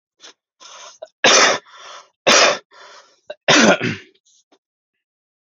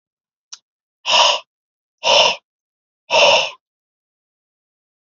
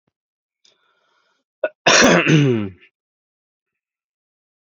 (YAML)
three_cough_length: 5.6 s
three_cough_amplitude: 32768
three_cough_signal_mean_std_ratio: 0.37
exhalation_length: 5.1 s
exhalation_amplitude: 30449
exhalation_signal_mean_std_ratio: 0.36
cough_length: 4.6 s
cough_amplitude: 30300
cough_signal_mean_std_ratio: 0.34
survey_phase: beta (2021-08-13 to 2022-03-07)
age: 18-44
gender: Male
wearing_mask: 'Yes'
symptom_none: true
smoker_status: Never smoked
respiratory_condition_asthma: false
respiratory_condition_other: false
recruitment_source: Test and Trace
submission_delay: -1 day
covid_test_result: Negative
covid_test_method: LFT